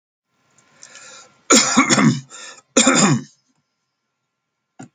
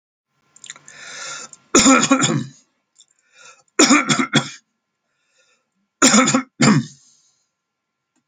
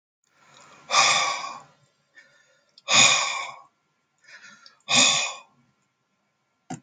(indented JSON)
{
  "cough_length": "4.9 s",
  "cough_amplitude": 32737,
  "cough_signal_mean_std_ratio": 0.39,
  "three_cough_length": "8.3 s",
  "three_cough_amplitude": 32768,
  "three_cough_signal_mean_std_ratio": 0.39,
  "exhalation_length": "6.8 s",
  "exhalation_amplitude": 25430,
  "exhalation_signal_mean_std_ratio": 0.38,
  "survey_phase": "alpha (2021-03-01 to 2021-08-12)",
  "age": "65+",
  "gender": "Male",
  "wearing_mask": "No",
  "symptom_none": true,
  "smoker_status": "Ex-smoker",
  "respiratory_condition_asthma": false,
  "respiratory_condition_other": false,
  "recruitment_source": "REACT",
  "submission_delay": "2 days",
  "covid_test_result": "Negative",
  "covid_test_method": "RT-qPCR"
}